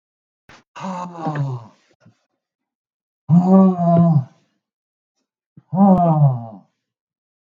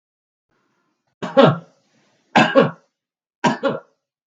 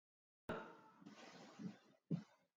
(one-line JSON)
{"exhalation_length": "7.4 s", "exhalation_amplitude": 32187, "exhalation_signal_mean_std_ratio": 0.44, "three_cough_length": "4.3 s", "three_cough_amplitude": 32768, "three_cough_signal_mean_std_ratio": 0.33, "cough_length": "2.6 s", "cough_amplitude": 808, "cough_signal_mean_std_ratio": 0.42, "survey_phase": "beta (2021-08-13 to 2022-03-07)", "age": "65+", "gender": "Male", "wearing_mask": "No", "symptom_none": true, "smoker_status": "Ex-smoker", "respiratory_condition_asthma": false, "respiratory_condition_other": false, "recruitment_source": "REACT", "submission_delay": "3 days", "covid_test_result": "Negative", "covid_test_method": "RT-qPCR", "influenza_a_test_result": "Negative", "influenza_b_test_result": "Negative"}